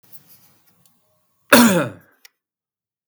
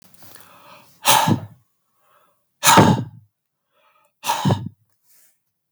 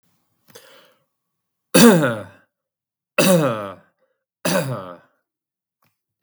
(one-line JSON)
{"cough_length": "3.1 s", "cough_amplitude": 32768, "cough_signal_mean_std_ratio": 0.27, "exhalation_length": "5.7 s", "exhalation_amplitude": 32768, "exhalation_signal_mean_std_ratio": 0.34, "three_cough_length": "6.2 s", "three_cough_amplitude": 32768, "three_cough_signal_mean_std_ratio": 0.33, "survey_phase": "beta (2021-08-13 to 2022-03-07)", "age": "45-64", "gender": "Male", "wearing_mask": "No", "symptom_none": true, "smoker_status": "Never smoked", "respiratory_condition_asthma": false, "respiratory_condition_other": false, "recruitment_source": "REACT", "submission_delay": "3 days", "covid_test_result": "Negative", "covid_test_method": "RT-qPCR", "influenza_a_test_result": "Negative", "influenza_b_test_result": "Negative"}